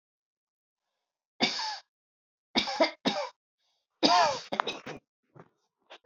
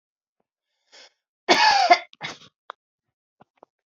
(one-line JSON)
{"three_cough_length": "6.1 s", "three_cough_amplitude": 15060, "three_cough_signal_mean_std_ratio": 0.35, "cough_length": "3.9 s", "cough_amplitude": 26296, "cough_signal_mean_std_ratio": 0.29, "survey_phase": "beta (2021-08-13 to 2022-03-07)", "age": "45-64", "gender": "Female", "wearing_mask": "No", "symptom_none": true, "smoker_status": "Never smoked", "respiratory_condition_asthma": false, "respiratory_condition_other": false, "recruitment_source": "REACT", "submission_delay": "1 day", "covid_test_result": "Negative", "covid_test_method": "RT-qPCR", "influenza_a_test_result": "Unknown/Void", "influenza_b_test_result": "Unknown/Void"}